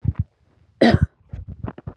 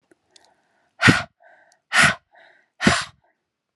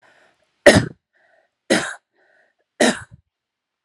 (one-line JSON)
{"cough_length": "2.0 s", "cough_amplitude": 28217, "cough_signal_mean_std_ratio": 0.35, "exhalation_length": "3.8 s", "exhalation_amplitude": 32560, "exhalation_signal_mean_std_ratio": 0.3, "three_cough_length": "3.8 s", "three_cough_amplitude": 32768, "three_cough_signal_mean_std_ratio": 0.26, "survey_phase": "alpha (2021-03-01 to 2021-08-12)", "age": "18-44", "gender": "Female", "wearing_mask": "No", "symptom_none": true, "smoker_status": "Never smoked", "respiratory_condition_asthma": false, "respiratory_condition_other": false, "recruitment_source": "REACT", "submission_delay": "2 days", "covid_test_result": "Negative", "covid_test_method": "RT-qPCR"}